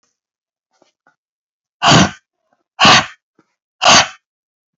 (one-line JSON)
{"exhalation_length": "4.8 s", "exhalation_amplitude": 32768, "exhalation_signal_mean_std_ratio": 0.33, "survey_phase": "beta (2021-08-13 to 2022-03-07)", "age": "18-44", "gender": "Male", "wearing_mask": "No", "symptom_cough_any": true, "symptom_shortness_of_breath": true, "symptom_fatigue": true, "symptom_fever_high_temperature": true, "symptom_headache": true, "smoker_status": "Never smoked", "respiratory_condition_asthma": true, "respiratory_condition_other": false, "recruitment_source": "Test and Trace", "submission_delay": "3 days", "covid_test_result": "Positive", "covid_test_method": "LFT"}